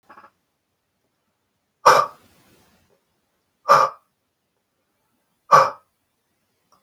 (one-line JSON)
{"exhalation_length": "6.8 s", "exhalation_amplitude": 32768, "exhalation_signal_mean_std_ratio": 0.23, "survey_phase": "beta (2021-08-13 to 2022-03-07)", "age": "18-44", "gender": "Male", "wearing_mask": "No", "symptom_none": true, "smoker_status": "Never smoked", "respiratory_condition_asthma": false, "respiratory_condition_other": false, "recruitment_source": "REACT", "submission_delay": "2 days", "covid_test_result": "Negative", "covid_test_method": "RT-qPCR"}